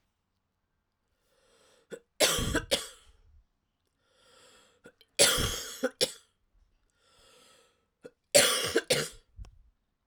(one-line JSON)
{"three_cough_length": "10.1 s", "three_cough_amplitude": 15562, "three_cough_signal_mean_std_ratio": 0.32, "survey_phase": "alpha (2021-03-01 to 2021-08-12)", "age": "45-64", "gender": "Female", "wearing_mask": "No", "symptom_cough_any": true, "symptom_new_continuous_cough": true, "symptom_fatigue": true, "symptom_fever_high_temperature": true, "symptom_headache": true, "symptom_change_to_sense_of_smell_or_taste": true, "symptom_loss_of_taste": true, "symptom_onset": "5 days", "smoker_status": "Ex-smoker", "respiratory_condition_asthma": false, "respiratory_condition_other": false, "recruitment_source": "Test and Trace", "submission_delay": "2 days", "covid_test_result": "Positive", "covid_test_method": "RT-qPCR", "covid_ct_value": 18.5, "covid_ct_gene": "ORF1ab gene", "covid_ct_mean": 19.2, "covid_viral_load": "490000 copies/ml", "covid_viral_load_category": "Low viral load (10K-1M copies/ml)"}